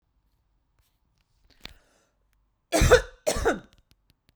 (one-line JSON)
{"cough_length": "4.4 s", "cough_amplitude": 22259, "cough_signal_mean_std_ratio": 0.27, "survey_phase": "beta (2021-08-13 to 2022-03-07)", "age": "45-64", "gender": "Female", "wearing_mask": "No", "symptom_none": true, "smoker_status": "Never smoked", "respiratory_condition_asthma": false, "respiratory_condition_other": false, "recruitment_source": "REACT", "submission_delay": "1 day", "covid_test_result": "Negative", "covid_test_method": "RT-qPCR"}